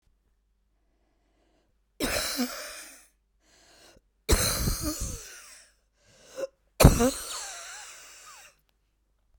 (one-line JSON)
{"three_cough_length": "9.4 s", "three_cough_amplitude": 32768, "three_cough_signal_mean_std_ratio": 0.32, "survey_phase": "beta (2021-08-13 to 2022-03-07)", "age": "18-44", "gender": "Female", "wearing_mask": "No", "symptom_cough_any": true, "symptom_new_continuous_cough": true, "symptom_sore_throat": true, "symptom_diarrhoea": true, "symptom_fatigue": true, "symptom_fever_high_temperature": true, "symptom_headache": true, "symptom_onset": "2 days", "smoker_status": "Current smoker (1 to 10 cigarettes per day)", "respiratory_condition_asthma": false, "respiratory_condition_other": false, "recruitment_source": "Test and Trace", "submission_delay": "1 day", "covid_test_result": "Negative", "covid_test_method": "RT-qPCR"}